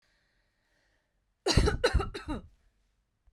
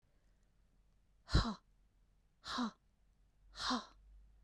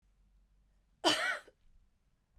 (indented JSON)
{
  "three_cough_length": "3.3 s",
  "three_cough_amplitude": 10386,
  "three_cough_signal_mean_std_ratio": 0.34,
  "exhalation_length": "4.4 s",
  "exhalation_amplitude": 4022,
  "exhalation_signal_mean_std_ratio": 0.32,
  "cough_length": "2.4 s",
  "cough_amplitude": 5833,
  "cough_signal_mean_std_ratio": 0.3,
  "survey_phase": "beta (2021-08-13 to 2022-03-07)",
  "age": "45-64",
  "gender": "Female",
  "wearing_mask": "No",
  "symptom_none": true,
  "smoker_status": "Never smoked",
  "respiratory_condition_asthma": false,
  "respiratory_condition_other": false,
  "recruitment_source": "REACT",
  "submission_delay": "1 day",
  "covid_test_result": "Negative",
  "covid_test_method": "RT-qPCR"
}